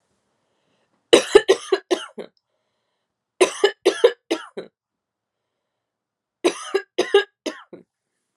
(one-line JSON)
{"three_cough_length": "8.4 s", "three_cough_amplitude": 32768, "three_cough_signal_mean_std_ratio": 0.28, "survey_phase": "alpha (2021-03-01 to 2021-08-12)", "age": "18-44", "gender": "Female", "wearing_mask": "No", "symptom_cough_any": true, "symptom_fatigue": true, "symptom_headache": true, "symptom_change_to_sense_of_smell_or_taste": true, "symptom_loss_of_taste": true, "symptom_onset": "5 days", "smoker_status": "Never smoked", "respiratory_condition_asthma": false, "respiratory_condition_other": false, "recruitment_source": "Test and Trace", "submission_delay": "2 days", "covid_test_result": "Positive", "covid_test_method": "RT-qPCR"}